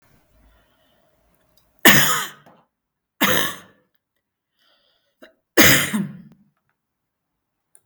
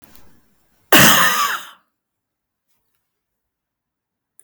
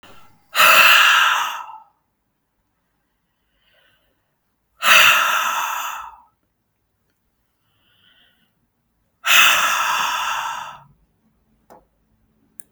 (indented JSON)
{
  "three_cough_length": "7.9 s",
  "three_cough_amplitude": 32768,
  "three_cough_signal_mean_std_ratio": 0.29,
  "cough_length": "4.4 s",
  "cough_amplitude": 32768,
  "cough_signal_mean_std_ratio": 0.31,
  "exhalation_length": "12.7 s",
  "exhalation_amplitude": 32768,
  "exhalation_signal_mean_std_ratio": 0.4,
  "survey_phase": "beta (2021-08-13 to 2022-03-07)",
  "age": "45-64",
  "gender": "Female",
  "wearing_mask": "Yes",
  "symptom_none": true,
  "smoker_status": "Never smoked",
  "respiratory_condition_asthma": false,
  "respiratory_condition_other": false,
  "recruitment_source": "REACT",
  "submission_delay": "2 days",
  "covid_test_result": "Negative",
  "covid_test_method": "RT-qPCR",
  "influenza_a_test_result": "Negative",
  "influenza_b_test_result": "Negative"
}